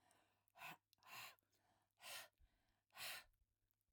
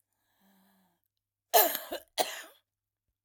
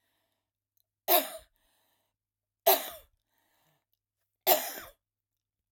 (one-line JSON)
{"exhalation_length": "3.9 s", "exhalation_amplitude": 443, "exhalation_signal_mean_std_ratio": 0.44, "cough_length": "3.2 s", "cough_amplitude": 14481, "cough_signal_mean_std_ratio": 0.26, "three_cough_length": "5.7 s", "three_cough_amplitude": 12166, "three_cough_signal_mean_std_ratio": 0.24, "survey_phase": "alpha (2021-03-01 to 2021-08-12)", "age": "45-64", "gender": "Female", "wearing_mask": "No", "symptom_none": true, "symptom_onset": "12 days", "smoker_status": "Current smoker (11 or more cigarettes per day)", "respiratory_condition_asthma": false, "respiratory_condition_other": false, "recruitment_source": "REACT", "submission_delay": "1 day", "covid_test_result": "Negative", "covid_test_method": "RT-qPCR"}